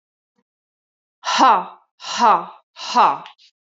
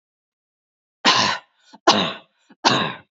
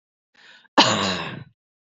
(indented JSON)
{
  "exhalation_length": "3.7 s",
  "exhalation_amplitude": 27658,
  "exhalation_signal_mean_std_ratio": 0.41,
  "three_cough_length": "3.2 s",
  "three_cough_amplitude": 30604,
  "three_cough_signal_mean_std_ratio": 0.4,
  "cough_length": "2.0 s",
  "cough_amplitude": 27479,
  "cough_signal_mean_std_ratio": 0.37,
  "survey_phase": "beta (2021-08-13 to 2022-03-07)",
  "age": "45-64",
  "gender": "Female",
  "wearing_mask": "No",
  "symptom_none": true,
  "smoker_status": "Never smoked",
  "respiratory_condition_asthma": true,
  "respiratory_condition_other": false,
  "recruitment_source": "REACT",
  "submission_delay": "3 days",
  "covid_test_result": "Negative",
  "covid_test_method": "RT-qPCR"
}